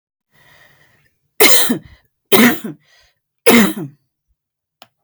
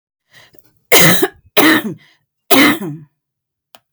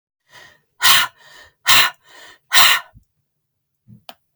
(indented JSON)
{
  "three_cough_length": "5.0 s",
  "three_cough_amplitude": 32768,
  "three_cough_signal_mean_std_ratio": 0.35,
  "cough_length": "3.9 s",
  "cough_amplitude": 32768,
  "cough_signal_mean_std_ratio": 0.42,
  "exhalation_length": "4.4 s",
  "exhalation_amplitude": 32768,
  "exhalation_signal_mean_std_ratio": 0.34,
  "survey_phase": "beta (2021-08-13 to 2022-03-07)",
  "age": "45-64",
  "gender": "Female",
  "wearing_mask": "No",
  "symptom_none": true,
  "smoker_status": "Never smoked",
  "respiratory_condition_asthma": false,
  "respiratory_condition_other": false,
  "recruitment_source": "Test and Trace",
  "submission_delay": "0 days",
  "covid_test_result": "Negative",
  "covid_test_method": "RT-qPCR"
}